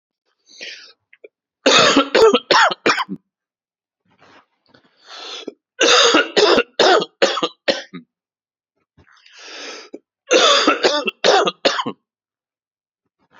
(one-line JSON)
{"three_cough_length": "13.4 s", "three_cough_amplitude": 32767, "three_cough_signal_mean_std_ratio": 0.43, "survey_phase": "beta (2021-08-13 to 2022-03-07)", "age": "45-64", "gender": "Male", "wearing_mask": "No", "symptom_cough_any": true, "symptom_runny_or_blocked_nose": true, "symptom_onset": "13 days", "smoker_status": "Never smoked", "respiratory_condition_asthma": false, "respiratory_condition_other": false, "recruitment_source": "REACT", "submission_delay": "3 days", "covid_test_result": "Negative", "covid_test_method": "RT-qPCR", "influenza_a_test_result": "Negative", "influenza_b_test_result": "Negative"}